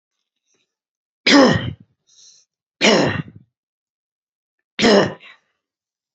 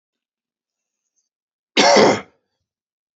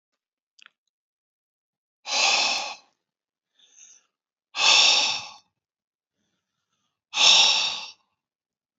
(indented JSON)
{
  "three_cough_length": "6.1 s",
  "three_cough_amplitude": 28132,
  "three_cough_signal_mean_std_ratio": 0.33,
  "cough_length": "3.2 s",
  "cough_amplitude": 29902,
  "cough_signal_mean_std_ratio": 0.3,
  "exhalation_length": "8.8 s",
  "exhalation_amplitude": 23341,
  "exhalation_signal_mean_std_ratio": 0.36,
  "survey_phase": "beta (2021-08-13 to 2022-03-07)",
  "age": "45-64",
  "gender": "Male",
  "wearing_mask": "No",
  "symptom_none": true,
  "smoker_status": "Never smoked",
  "respiratory_condition_asthma": false,
  "respiratory_condition_other": false,
  "recruitment_source": "REACT",
  "submission_delay": "2 days",
  "covid_test_result": "Negative",
  "covid_test_method": "RT-qPCR"
}